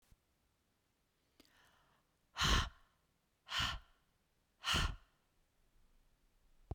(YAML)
exhalation_length: 6.7 s
exhalation_amplitude: 4109
exhalation_signal_mean_std_ratio: 0.3
survey_phase: beta (2021-08-13 to 2022-03-07)
age: 65+
gender: Female
wearing_mask: 'No'
symptom_none: true
symptom_onset: 12 days
smoker_status: Ex-smoker
respiratory_condition_asthma: false
respiratory_condition_other: false
recruitment_source: REACT
submission_delay: 1 day
covid_test_result: Negative
covid_test_method: RT-qPCR